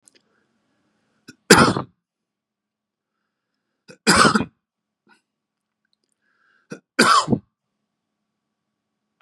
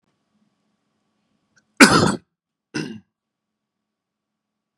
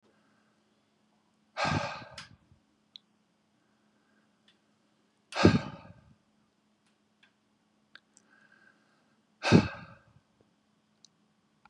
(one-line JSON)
{"three_cough_length": "9.2 s", "three_cough_amplitude": 32768, "three_cough_signal_mean_std_ratio": 0.24, "cough_length": "4.8 s", "cough_amplitude": 32768, "cough_signal_mean_std_ratio": 0.2, "exhalation_length": "11.7 s", "exhalation_amplitude": 16678, "exhalation_signal_mean_std_ratio": 0.2, "survey_phase": "beta (2021-08-13 to 2022-03-07)", "age": "45-64", "gender": "Male", "wearing_mask": "No", "symptom_none": true, "smoker_status": "Never smoked", "respiratory_condition_asthma": false, "respiratory_condition_other": false, "recruitment_source": "REACT", "submission_delay": "2 days", "covid_test_result": "Negative", "covid_test_method": "RT-qPCR", "influenza_a_test_result": "Negative", "influenza_b_test_result": "Negative"}